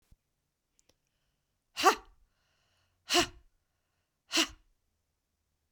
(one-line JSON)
{"exhalation_length": "5.7 s", "exhalation_amplitude": 13320, "exhalation_signal_mean_std_ratio": 0.21, "survey_phase": "beta (2021-08-13 to 2022-03-07)", "age": "45-64", "gender": "Female", "wearing_mask": "No", "symptom_change_to_sense_of_smell_or_taste": true, "smoker_status": "Current smoker (e-cigarettes or vapes only)", "respiratory_condition_asthma": false, "respiratory_condition_other": false, "recruitment_source": "REACT", "submission_delay": "1 day", "covid_test_result": "Negative", "covid_test_method": "RT-qPCR"}